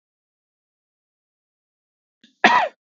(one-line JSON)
{"cough_length": "2.9 s", "cough_amplitude": 32766, "cough_signal_mean_std_ratio": 0.21, "survey_phase": "beta (2021-08-13 to 2022-03-07)", "age": "18-44", "gender": "Male", "wearing_mask": "No", "symptom_none": true, "smoker_status": "Ex-smoker", "respiratory_condition_asthma": false, "respiratory_condition_other": false, "recruitment_source": "REACT", "submission_delay": "1 day", "covid_test_result": "Negative", "covid_test_method": "RT-qPCR", "influenza_a_test_result": "Negative", "influenza_b_test_result": "Negative"}